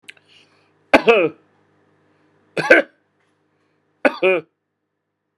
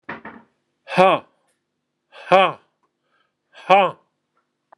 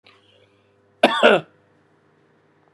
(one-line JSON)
{"three_cough_length": "5.4 s", "three_cough_amplitude": 32768, "three_cough_signal_mean_std_ratio": 0.28, "exhalation_length": "4.8 s", "exhalation_amplitude": 32767, "exhalation_signal_mean_std_ratio": 0.28, "cough_length": "2.7 s", "cough_amplitude": 32715, "cough_signal_mean_std_ratio": 0.26, "survey_phase": "beta (2021-08-13 to 2022-03-07)", "age": "65+", "gender": "Male", "wearing_mask": "No", "symptom_none": true, "smoker_status": "Never smoked", "respiratory_condition_asthma": false, "respiratory_condition_other": false, "recruitment_source": "REACT", "submission_delay": "2 days", "covid_test_result": "Negative", "covid_test_method": "RT-qPCR"}